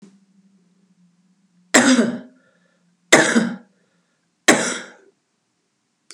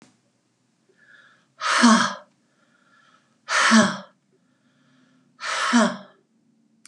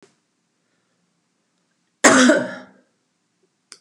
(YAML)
three_cough_length: 6.1 s
three_cough_amplitude: 32768
three_cough_signal_mean_std_ratio: 0.32
exhalation_length: 6.9 s
exhalation_amplitude: 25203
exhalation_signal_mean_std_ratio: 0.36
cough_length: 3.8 s
cough_amplitude: 32767
cough_signal_mean_std_ratio: 0.27
survey_phase: beta (2021-08-13 to 2022-03-07)
age: 45-64
gender: Female
wearing_mask: 'No'
symptom_none: true
smoker_status: Never smoked
respiratory_condition_asthma: false
respiratory_condition_other: false
recruitment_source: REACT
submission_delay: 2 days
covid_test_result: Negative
covid_test_method: RT-qPCR